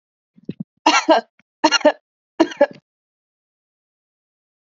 {"three_cough_length": "4.7 s", "three_cough_amplitude": 30039, "three_cough_signal_mean_std_ratio": 0.28, "survey_phase": "beta (2021-08-13 to 2022-03-07)", "age": "45-64", "gender": "Female", "wearing_mask": "No", "symptom_none": true, "smoker_status": "Never smoked", "respiratory_condition_asthma": false, "respiratory_condition_other": false, "recruitment_source": "REACT", "submission_delay": "3 days", "covid_test_result": "Negative", "covid_test_method": "RT-qPCR", "influenza_a_test_result": "Unknown/Void", "influenza_b_test_result": "Unknown/Void"}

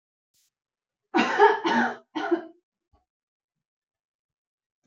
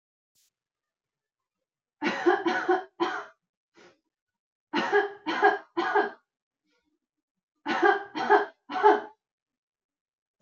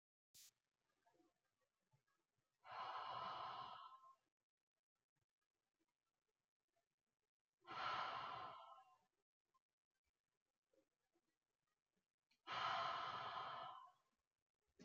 {"cough_length": "4.9 s", "cough_amplitude": 19033, "cough_signal_mean_std_ratio": 0.33, "three_cough_length": "10.4 s", "three_cough_amplitude": 15645, "three_cough_signal_mean_std_ratio": 0.39, "exhalation_length": "14.8 s", "exhalation_amplitude": 763, "exhalation_signal_mean_std_ratio": 0.41, "survey_phase": "alpha (2021-03-01 to 2021-08-12)", "age": "18-44", "gender": "Female", "wearing_mask": "No", "symptom_none": true, "smoker_status": "Never smoked", "respiratory_condition_asthma": false, "respiratory_condition_other": false, "recruitment_source": "REACT", "submission_delay": "1 day", "covid_test_result": "Negative", "covid_test_method": "RT-qPCR"}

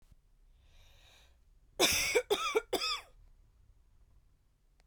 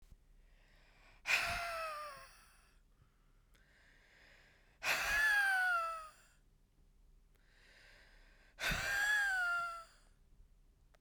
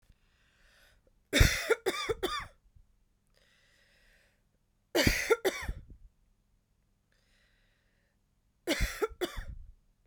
{"cough_length": "4.9 s", "cough_amplitude": 7143, "cough_signal_mean_std_ratio": 0.38, "exhalation_length": "11.0 s", "exhalation_amplitude": 3455, "exhalation_signal_mean_std_ratio": 0.51, "three_cough_length": "10.1 s", "three_cough_amplitude": 13495, "three_cough_signal_mean_std_ratio": 0.32, "survey_phase": "beta (2021-08-13 to 2022-03-07)", "age": "18-44", "gender": "Female", "wearing_mask": "No", "symptom_runny_or_blocked_nose": true, "symptom_shortness_of_breath": true, "symptom_diarrhoea": true, "symptom_fatigue": true, "symptom_fever_high_temperature": true, "symptom_headache": true, "symptom_change_to_sense_of_smell_or_taste": true, "symptom_loss_of_taste": true, "symptom_onset": "2 days", "smoker_status": "Current smoker (e-cigarettes or vapes only)", "respiratory_condition_asthma": true, "respiratory_condition_other": false, "recruitment_source": "Test and Trace", "submission_delay": "2 days", "covid_test_result": "Positive", "covid_test_method": "RT-qPCR", "covid_ct_value": 18.6, "covid_ct_gene": "N gene"}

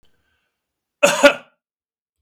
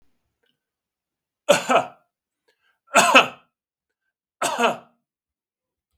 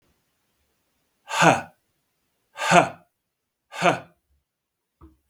{"cough_length": "2.2 s", "cough_amplitude": 32768, "cough_signal_mean_std_ratio": 0.26, "three_cough_length": "6.0 s", "three_cough_amplitude": 32768, "three_cough_signal_mean_std_ratio": 0.28, "exhalation_length": "5.3 s", "exhalation_amplitude": 32768, "exhalation_signal_mean_std_ratio": 0.27, "survey_phase": "beta (2021-08-13 to 2022-03-07)", "age": "45-64", "gender": "Male", "wearing_mask": "No", "symptom_none": true, "smoker_status": "Never smoked", "respiratory_condition_asthma": false, "respiratory_condition_other": false, "recruitment_source": "REACT", "submission_delay": "2 days", "covid_test_result": "Negative", "covid_test_method": "RT-qPCR"}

